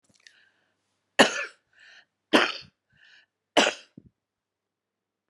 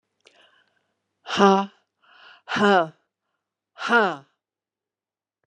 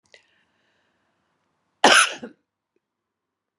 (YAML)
three_cough_length: 5.3 s
three_cough_amplitude: 24323
three_cough_signal_mean_std_ratio: 0.23
exhalation_length: 5.5 s
exhalation_amplitude: 27955
exhalation_signal_mean_std_ratio: 0.32
cough_length: 3.6 s
cough_amplitude: 31929
cough_signal_mean_std_ratio: 0.21
survey_phase: beta (2021-08-13 to 2022-03-07)
age: 65+
gender: Female
wearing_mask: 'No'
symptom_cough_any: true
symptom_runny_or_blocked_nose: true
symptom_fatigue: true
symptom_headache: true
symptom_change_to_sense_of_smell_or_taste: true
symptom_loss_of_taste: true
symptom_other: true
symptom_onset: 3 days
smoker_status: Ex-smoker
respiratory_condition_asthma: false
respiratory_condition_other: false
recruitment_source: Test and Trace
submission_delay: 1 day
covid_test_result: Positive
covid_test_method: ePCR